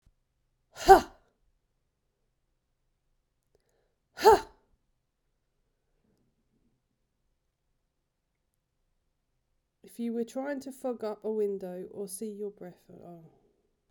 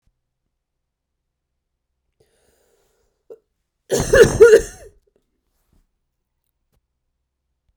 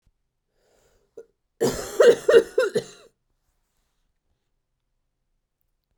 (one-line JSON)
{"exhalation_length": "13.9 s", "exhalation_amplitude": 25340, "exhalation_signal_mean_std_ratio": 0.21, "three_cough_length": "7.8 s", "three_cough_amplitude": 32768, "three_cough_signal_mean_std_ratio": 0.21, "cough_length": "6.0 s", "cough_amplitude": 24843, "cough_signal_mean_std_ratio": 0.26, "survey_phase": "beta (2021-08-13 to 2022-03-07)", "age": "18-44", "gender": "Female", "wearing_mask": "No", "symptom_cough_any": true, "smoker_status": "Current smoker (1 to 10 cigarettes per day)", "respiratory_condition_asthma": true, "respiratory_condition_other": false, "recruitment_source": "Test and Trace", "submission_delay": "2 days", "covid_test_result": "Positive", "covid_test_method": "ePCR"}